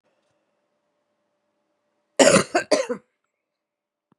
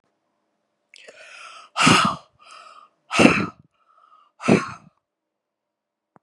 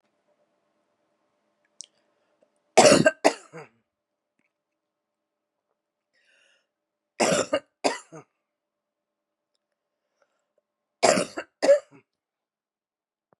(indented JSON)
{
  "cough_length": "4.2 s",
  "cough_amplitude": 32540,
  "cough_signal_mean_std_ratio": 0.25,
  "exhalation_length": "6.2 s",
  "exhalation_amplitude": 32767,
  "exhalation_signal_mean_std_ratio": 0.3,
  "three_cough_length": "13.4 s",
  "three_cough_amplitude": 28715,
  "three_cough_signal_mean_std_ratio": 0.22,
  "survey_phase": "beta (2021-08-13 to 2022-03-07)",
  "age": "45-64",
  "gender": "Female",
  "wearing_mask": "No",
  "symptom_cough_any": true,
  "symptom_runny_or_blocked_nose": true,
  "symptom_sore_throat": true,
  "symptom_fatigue": true,
  "symptom_headache": true,
  "smoker_status": "Ex-smoker",
  "respiratory_condition_asthma": false,
  "respiratory_condition_other": false,
  "recruitment_source": "Test and Trace",
  "submission_delay": "2 days",
  "covid_test_result": "Positive",
  "covid_test_method": "RT-qPCR"
}